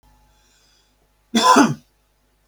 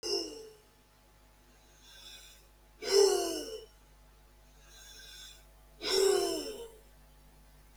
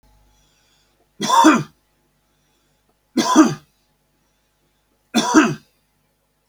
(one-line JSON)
{"cough_length": "2.5 s", "cough_amplitude": 32768, "cough_signal_mean_std_ratio": 0.32, "exhalation_length": "7.8 s", "exhalation_amplitude": 7793, "exhalation_signal_mean_std_ratio": 0.41, "three_cough_length": "6.5 s", "three_cough_amplitude": 32766, "three_cough_signal_mean_std_ratio": 0.32, "survey_phase": "beta (2021-08-13 to 2022-03-07)", "age": "45-64", "gender": "Male", "wearing_mask": "No", "symptom_none": true, "smoker_status": "Never smoked", "respiratory_condition_asthma": false, "respiratory_condition_other": false, "recruitment_source": "REACT", "submission_delay": "1 day", "covid_test_result": "Negative", "covid_test_method": "RT-qPCR", "influenza_a_test_result": "Negative", "influenza_b_test_result": "Negative"}